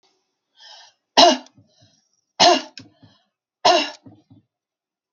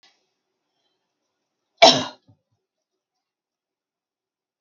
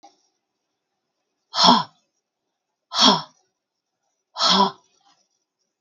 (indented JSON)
{
  "three_cough_length": "5.1 s",
  "three_cough_amplitude": 32768,
  "three_cough_signal_mean_std_ratio": 0.28,
  "cough_length": "4.6 s",
  "cough_amplitude": 32768,
  "cough_signal_mean_std_ratio": 0.15,
  "exhalation_length": "5.8 s",
  "exhalation_amplitude": 32623,
  "exhalation_signal_mean_std_ratio": 0.3,
  "survey_phase": "beta (2021-08-13 to 2022-03-07)",
  "age": "45-64",
  "gender": "Female",
  "wearing_mask": "No",
  "symptom_none": true,
  "symptom_onset": "12 days",
  "smoker_status": "Never smoked",
  "respiratory_condition_asthma": false,
  "respiratory_condition_other": false,
  "recruitment_source": "REACT",
  "submission_delay": "3 days",
  "covid_test_result": "Negative",
  "covid_test_method": "RT-qPCR",
  "influenza_a_test_result": "Negative",
  "influenza_b_test_result": "Negative"
}